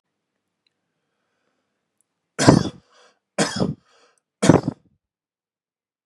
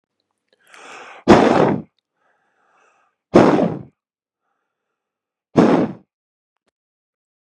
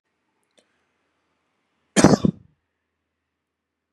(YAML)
three_cough_length: 6.1 s
three_cough_amplitude: 32768
three_cough_signal_mean_std_ratio: 0.24
exhalation_length: 7.6 s
exhalation_amplitude: 32768
exhalation_signal_mean_std_ratio: 0.31
cough_length: 3.9 s
cough_amplitude: 32768
cough_signal_mean_std_ratio: 0.18
survey_phase: beta (2021-08-13 to 2022-03-07)
age: 18-44
gender: Male
wearing_mask: 'No'
symptom_none: true
smoker_status: Never smoked
respiratory_condition_asthma: false
respiratory_condition_other: false
recruitment_source: REACT
submission_delay: 2 days
covid_test_result: Negative
covid_test_method: RT-qPCR
influenza_a_test_result: Negative
influenza_b_test_result: Negative